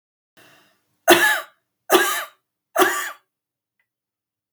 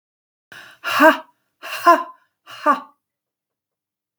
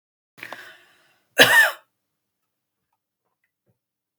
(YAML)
three_cough_length: 4.5 s
three_cough_amplitude: 32767
three_cough_signal_mean_std_ratio: 0.34
exhalation_length: 4.2 s
exhalation_amplitude: 32650
exhalation_signal_mean_std_ratio: 0.3
cough_length: 4.2 s
cough_amplitude: 32766
cough_signal_mean_std_ratio: 0.23
survey_phase: beta (2021-08-13 to 2022-03-07)
age: 65+
gender: Female
wearing_mask: 'No'
symptom_none: true
symptom_onset: 7 days
smoker_status: Never smoked
respiratory_condition_asthma: true
respiratory_condition_other: false
recruitment_source: Test and Trace
submission_delay: 4 days
covid_test_result: Negative
covid_test_method: RT-qPCR